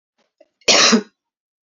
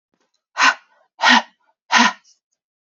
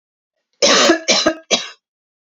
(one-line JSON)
{"cough_length": "1.6 s", "cough_amplitude": 32767, "cough_signal_mean_std_ratio": 0.37, "exhalation_length": "3.0 s", "exhalation_amplitude": 29700, "exhalation_signal_mean_std_ratio": 0.34, "three_cough_length": "2.3 s", "three_cough_amplitude": 32768, "three_cough_signal_mean_std_ratio": 0.47, "survey_phase": "beta (2021-08-13 to 2022-03-07)", "age": "18-44", "gender": "Female", "wearing_mask": "No", "symptom_new_continuous_cough": true, "symptom_runny_or_blocked_nose": true, "symptom_loss_of_taste": true, "symptom_other": true, "symptom_onset": "3 days", "smoker_status": "Ex-smoker", "respiratory_condition_asthma": false, "respiratory_condition_other": false, "recruitment_source": "Test and Trace", "submission_delay": "2 days", "covid_test_result": "Positive", "covid_test_method": "RT-qPCR", "covid_ct_value": 24.2, "covid_ct_gene": "ORF1ab gene"}